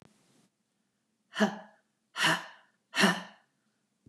{
  "exhalation_length": "4.1 s",
  "exhalation_amplitude": 9024,
  "exhalation_signal_mean_std_ratio": 0.31,
  "survey_phase": "beta (2021-08-13 to 2022-03-07)",
  "age": "65+",
  "gender": "Female",
  "wearing_mask": "No",
  "symptom_none": true,
  "smoker_status": "Never smoked",
  "respiratory_condition_asthma": false,
  "respiratory_condition_other": false,
  "recruitment_source": "REACT",
  "submission_delay": "2 days",
  "covid_test_result": "Negative",
  "covid_test_method": "RT-qPCR",
  "influenza_a_test_result": "Negative",
  "influenza_b_test_result": "Negative"
}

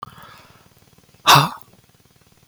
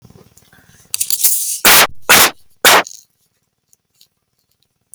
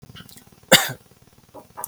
{
  "exhalation_length": "2.5 s",
  "exhalation_amplitude": 32768,
  "exhalation_signal_mean_std_ratio": 0.25,
  "three_cough_length": "4.9 s",
  "three_cough_amplitude": 32768,
  "three_cough_signal_mean_std_ratio": 0.4,
  "cough_length": "1.9 s",
  "cough_amplitude": 32768,
  "cough_signal_mean_std_ratio": 0.25,
  "survey_phase": "beta (2021-08-13 to 2022-03-07)",
  "age": "18-44",
  "gender": "Male",
  "wearing_mask": "Yes",
  "symptom_none": true,
  "smoker_status": "Never smoked",
  "respiratory_condition_asthma": false,
  "respiratory_condition_other": false,
  "recruitment_source": "REACT",
  "submission_delay": "2 days",
  "covid_test_result": "Negative",
  "covid_test_method": "RT-qPCR",
  "influenza_a_test_result": "Negative",
  "influenza_b_test_result": "Negative"
}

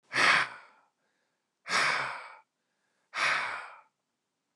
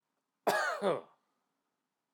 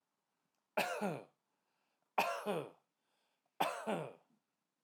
{
  "exhalation_length": "4.6 s",
  "exhalation_amplitude": 9266,
  "exhalation_signal_mean_std_ratio": 0.43,
  "cough_length": "2.1 s",
  "cough_amplitude": 4574,
  "cough_signal_mean_std_ratio": 0.39,
  "three_cough_length": "4.8 s",
  "three_cough_amplitude": 3137,
  "three_cough_signal_mean_std_ratio": 0.4,
  "survey_phase": "alpha (2021-03-01 to 2021-08-12)",
  "age": "45-64",
  "gender": "Male",
  "wearing_mask": "No",
  "symptom_none": true,
  "smoker_status": "Prefer not to say",
  "respiratory_condition_asthma": false,
  "respiratory_condition_other": false,
  "recruitment_source": "REACT",
  "submission_delay": "4 days",
  "covid_test_result": "Negative",
  "covid_test_method": "RT-qPCR"
}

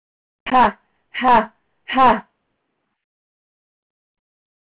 {
  "exhalation_length": "4.6 s",
  "exhalation_amplitude": 23350,
  "exhalation_signal_mean_std_ratio": 0.32,
  "survey_phase": "alpha (2021-03-01 to 2021-08-12)",
  "age": "45-64",
  "gender": "Female",
  "wearing_mask": "Yes",
  "symptom_none": true,
  "smoker_status": "Never smoked",
  "respiratory_condition_asthma": false,
  "respiratory_condition_other": false,
  "recruitment_source": "REACT",
  "submission_delay": "7 days",
  "covid_test_result": "Negative",
  "covid_test_method": "RT-qPCR"
}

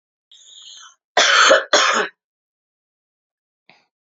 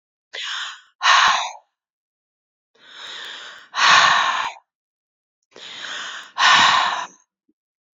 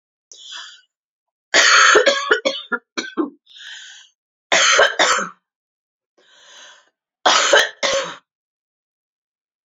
{
  "cough_length": "4.0 s",
  "cough_amplitude": 29526,
  "cough_signal_mean_std_ratio": 0.37,
  "exhalation_length": "7.9 s",
  "exhalation_amplitude": 28952,
  "exhalation_signal_mean_std_ratio": 0.44,
  "three_cough_length": "9.6 s",
  "three_cough_amplitude": 32767,
  "three_cough_signal_mean_std_ratio": 0.42,
  "survey_phase": "beta (2021-08-13 to 2022-03-07)",
  "age": "45-64",
  "gender": "Female",
  "wearing_mask": "No",
  "symptom_new_continuous_cough": true,
  "symptom_sore_throat": true,
  "smoker_status": "Never smoked",
  "respiratory_condition_asthma": false,
  "respiratory_condition_other": false,
  "recruitment_source": "Test and Trace",
  "submission_delay": "2 days",
  "covid_test_result": "Positive",
  "covid_test_method": "RT-qPCR"
}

